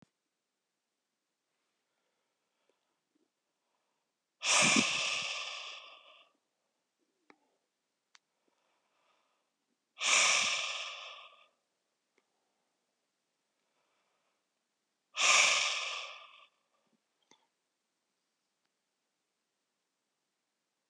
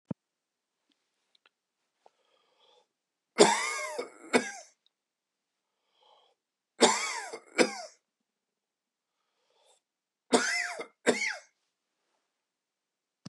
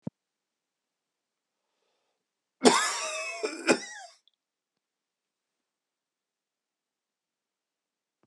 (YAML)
exhalation_length: 20.9 s
exhalation_amplitude: 7662
exhalation_signal_mean_std_ratio: 0.28
three_cough_length: 13.3 s
three_cough_amplitude: 21636
three_cough_signal_mean_std_ratio: 0.26
cough_length: 8.3 s
cough_amplitude: 21620
cough_signal_mean_std_ratio: 0.22
survey_phase: beta (2021-08-13 to 2022-03-07)
age: 45-64
gender: Male
wearing_mask: 'No'
symptom_cough_any: true
symptom_runny_or_blocked_nose: true
symptom_diarrhoea: true
symptom_fatigue: true
symptom_onset: 3 days
smoker_status: Ex-smoker
respiratory_condition_asthma: false
respiratory_condition_other: false
recruitment_source: Test and Trace
submission_delay: 1 day
covid_test_result: Positive
covid_test_method: RT-qPCR
covid_ct_value: 28.4
covid_ct_gene: ORF1ab gene